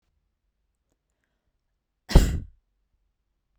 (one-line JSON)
{"cough_length": "3.6 s", "cough_amplitude": 30507, "cough_signal_mean_std_ratio": 0.18, "survey_phase": "beta (2021-08-13 to 2022-03-07)", "age": "18-44", "gender": "Female", "wearing_mask": "No", "symptom_none": true, "smoker_status": "Never smoked", "respiratory_condition_asthma": false, "respiratory_condition_other": false, "recruitment_source": "REACT", "submission_delay": "11 days", "covid_test_result": "Negative", "covid_test_method": "RT-qPCR"}